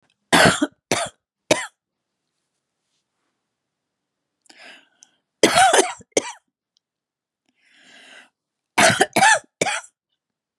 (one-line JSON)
{"three_cough_length": "10.6 s", "three_cough_amplitude": 32739, "three_cough_signal_mean_std_ratio": 0.31, "survey_phase": "beta (2021-08-13 to 2022-03-07)", "age": "65+", "gender": "Female", "wearing_mask": "No", "symptom_cough_any": true, "symptom_runny_or_blocked_nose": true, "symptom_onset": "11 days", "smoker_status": "Never smoked", "respiratory_condition_asthma": false, "respiratory_condition_other": false, "recruitment_source": "REACT", "submission_delay": "1 day", "covid_test_result": "Negative", "covid_test_method": "RT-qPCR", "influenza_a_test_result": "Negative", "influenza_b_test_result": "Negative"}